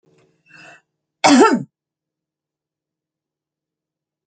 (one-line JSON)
{"cough_length": "4.3 s", "cough_amplitude": 29533, "cough_signal_mean_std_ratio": 0.24, "survey_phase": "alpha (2021-03-01 to 2021-08-12)", "age": "65+", "gender": "Female", "wearing_mask": "No", "symptom_none": true, "smoker_status": "Never smoked", "respiratory_condition_asthma": false, "respiratory_condition_other": false, "recruitment_source": "REACT", "submission_delay": "1 day", "covid_test_result": "Negative", "covid_test_method": "RT-qPCR"}